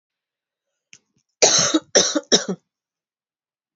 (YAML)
three_cough_length: 3.8 s
three_cough_amplitude: 30116
three_cough_signal_mean_std_ratio: 0.34
survey_phase: beta (2021-08-13 to 2022-03-07)
age: 18-44
gender: Female
wearing_mask: 'No'
symptom_cough_any: true
symptom_runny_or_blocked_nose: true
symptom_sore_throat: true
symptom_fatigue: true
symptom_headache: true
symptom_change_to_sense_of_smell_or_taste: true
symptom_onset: 3 days
smoker_status: Never smoked
respiratory_condition_asthma: false
respiratory_condition_other: false
recruitment_source: Test and Trace
submission_delay: 1 day
covid_test_result: Positive
covid_test_method: RT-qPCR
covid_ct_value: 24.6
covid_ct_gene: ORF1ab gene
covid_ct_mean: 25.1
covid_viral_load: 5700 copies/ml
covid_viral_load_category: Minimal viral load (< 10K copies/ml)